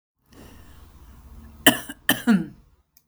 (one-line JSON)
{"cough_length": "3.1 s", "cough_amplitude": 32768, "cough_signal_mean_std_ratio": 0.3, "survey_phase": "beta (2021-08-13 to 2022-03-07)", "age": "45-64", "gender": "Female", "wearing_mask": "No", "symptom_none": true, "smoker_status": "Never smoked", "respiratory_condition_asthma": true, "respiratory_condition_other": false, "recruitment_source": "REACT", "submission_delay": "4 days", "covid_test_result": "Negative", "covid_test_method": "RT-qPCR"}